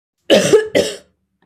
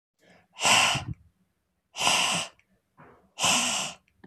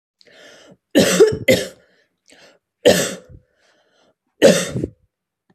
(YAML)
cough_length: 1.5 s
cough_amplitude: 29291
cough_signal_mean_std_ratio: 0.49
exhalation_length: 4.3 s
exhalation_amplitude: 15417
exhalation_signal_mean_std_ratio: 0.48
three_cough_length: 5.5 s
three_cough_amplitude: 30211
three_cough_signal_mean_std_ratio: 0.36
survey_phase: beta (2021-08-13 to 2022-03-07)
age: 45-64
gender: Female
wearing_mask: 'No'
symptom_sore_throat: true
symptom_onset: 12 days
smoker_status: Never smoked
respiratory_condition_asthma: false
respiratory_condition_other: false
recruitment_source: REACT
submission_delay: 1 day
covid_test_result: Negative
covid_test_method: RT-qPCR